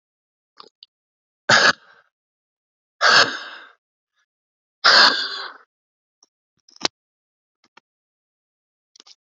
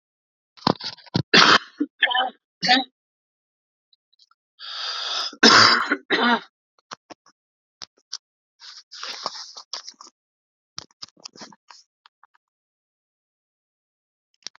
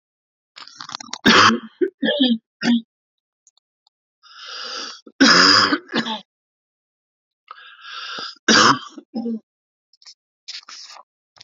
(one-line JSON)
{"exhalation_length": "9.2 s", "exhalation_amplitude": 32768, "exhalation_signal_mean_std_ratio": 0.26, "cough_length": "14.6 s", "cough_amplitude": 32521, "cough_signal_mean_std_ratio": 0.29, "three_cough_length": "11.4 s", "three_cough_amplitude": 32767, "three_cough_signal_mean_std_ratio": 0.38, "survey_phase": "alpha (2021-03-01 to 2021-08-12)", "age": "18-44", "gender": "Female", "wearing_mask": "No", "symptom_cough_any": true, "symptom_diarrhoea": true, "symptom_fatigue": true, "symptom_fever_high_temperature": true, "symptom_headache": true, "symptom_change_to_sense_of_smell_or_taste": true, "symptom_onset": "2 days", "smoker_status": "Ex-smoker", "respiratory_condition_asthma": true, "respiratory_condition_other": false, "recruitment_source": "Test and Trace", "submission_delay": "1 day", "covid_test_result": "Positive", "covid_test_method": "RT-qPCR"}